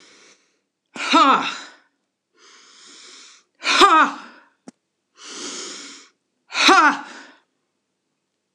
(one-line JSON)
{"exhalation_length": "8.5 s", "exhalation_amplitude": 26028, "exhalation_signal_mean_std_ratio": 0.35, "survey_phase": "alpha (2021-03-01 to 2021-08-12)", "age": "65+", "gender": "Female", "wearing_mask": "No", "symptom_none": true, "smoker_status": "Never smoked", "respiratory_condition_asthma": false, "respiratory_condition_other": false, "recruitment_source": "REACT", "submission_delay": "12 days", "covid_test_result": "Negative", "covid_test_method": "RT-qPCR"}